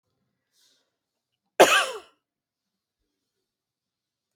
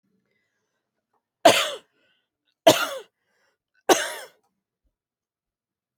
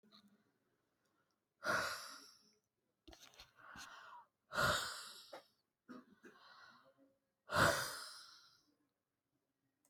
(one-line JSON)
{"cough_length": "4.4 s", "cough_amplitude": 28898, "cough_signal_mean_std_ratio": 0.18, "three_cough_length": "6.0 s", "three_cough_amplitude": 29463, "three_cough_signal_mean_std_ratio": 0.23, "exhalation_length": "9.9 s", "exhalation_amplitude": 3538, "exhalation_signal_mean_std_ratio": 0.33, "survey_phase": "alpha (2021-03-01 to 2021-08-12)", "age": "45-64", "gender": "Female", "wearing_mask": "No", "symptom_none": true, "smoker_status": "Ex-smoker", "respiratory_condition_asthma": false, "respiratory_condition_other": false, "recruitment_source": "REACT", "submission_delay": "1 day", "covid_test_result": "Negative", "covid_test_method": "RT-qPCR"}